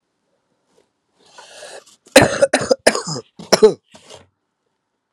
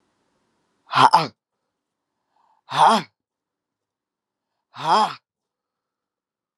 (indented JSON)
{
  "cough_length": "5.1 s",
  "cough_amplitude": 32768,
  "cough_signal_mean_std_ratio": 0.28,
  "exhalation_length": "6.6 s",
  "exhalation_amplitude": 32162,
  "exhalation_signal_mean_std_ratio": 0.27,
  "survey_phase": "beta (2021-08-13 to 2022-03-07)",
  "age": "45-64",
  "gender": "Female",
  "wearing_mask": "No",
  "symptom_runny_or_blocked_nose": true,
  "symptom_sore_throat": true,
  "symptom_headache": true,
  "symptom_onset": "3 days",
  "smoker_status": "Never smoked",
  "respiratory_condition_asthma": false,
  "respiratory_condition_other": false,
  "recruitment_source": "Test and Trace",
  "submission_delay": "1 day",
  "covid_test_result": "Positive",
  "covid_test_method": "RT-qPCR"
}